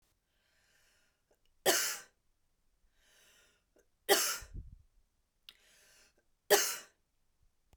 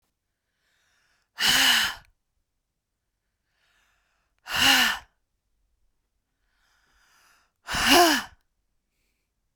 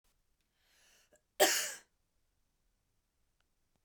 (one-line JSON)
{"three_cough_length": "7.8 s", "three_cough_amplitude": 8606, "three_cough_signal_mean_std_ratio": 0.26, "exhalation_length": "9.6 s", "exhalation_amplitude": 20740, "exhalation_signal_mean_std_ratio": 0.31, "cough_length": "3.8 s", "cough_amplitude": 10474, "cough_signal_mean_std_ratio": 0.21, "survey_phase": "beta (2021-08-13 to 2022-03-07)", "age": "18-44", "gender": "Female", "wearing_mask": "No", "symptom_cough_any": true, "symptom_new_continuous_cough": true, "symptom_runny_or_blocked_nose": true, "symptom_shortness_of_breath": true, "symptom_sore_throat": true, "symptom_abdominal_pain": true, "symptom_fatigue": true, "symptom_headache": true, "symptom_other": true, "smoker_status": "Never smoked", "respiratory_condition_asthma": false, "respiratory_condition_other": false, "recruitment_source": "Test and Trace", "submission_delay": "2 days", "covid_test_result": "Positive", "covid_test_method": "RT-qPCR", "covid_ct_value": 27.3, "covid_ct_gene": "N gene"}